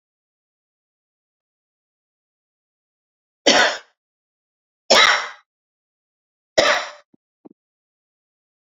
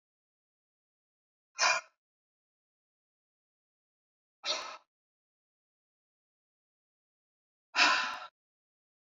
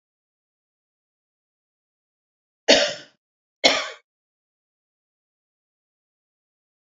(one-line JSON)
{"three_cough_length": "8.6 s", "three_cough_amplitude": 32083, "three_cough_signal_mean_std_ratio": 0.24, "exhalation_length": "9.1 s", "exhalation_amplitude": 8943, "exhalation_signal_mean_std_ratio": 0.22, "cough_length": "6.8 s", "cough_amplitude": 26887, "cough_signal_mean_std_ratio": 0.18, "survey_phase": "alpha (2021-03-01 to 2021-08-12)", "age": "18-44", "gender": "Female", "wearing_mask": "No", "symptom_none": true, "smoker_status": "Never smoked", "respiratory_condition_asthma": false, "respiratory_condition_other": false, "recruitment_source": "REACT", "submission_delay": "3 days", "covid_test_result": "Negative", "covid_test_method": "RT-qPCR"}